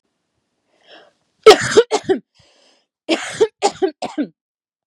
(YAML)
cough_length: 4.9 s
cough_amplitude: 32768
cough_signal_mean_std_ratio: 0.31
survey_phase: beta (2021-08-13 to 2022-03-07)
age: 45-64
gender: Female
wearing_mask: 'No'
symptom_fatigue: true
symptom_onset: 12 days
smoker_status: Never smoked
respiratory_condition_asthma: false
respiratory_condition_other: false
recruitment_source: REACT
submission_delay: 1 day
covid_test_result: Negative
covid_test_method: RT-qPCR
influenza_a_test_result: Negative
influenza_b_test_result: Negative